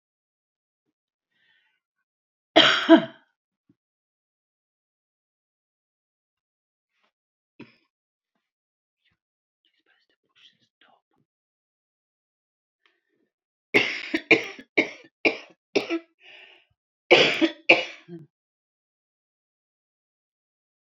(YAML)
cough_length: 20.9 s
cough_amplitude: 32767
cough_signal_mean_std_ratio: 0.2
survey_phase: beta (2021-08-13 to 2022-03-07)
age: 65+
gender: Female
wearing_mask: 'No'
symptom_none: true
smoker_status: Ex-smoker
respiratory_condition_asthma: false
respiratory_condition_other: true
recruitment_source: REACT
submission_delay: 24 days
covid_test_result: Negative
covid_test_method: RT-qPCR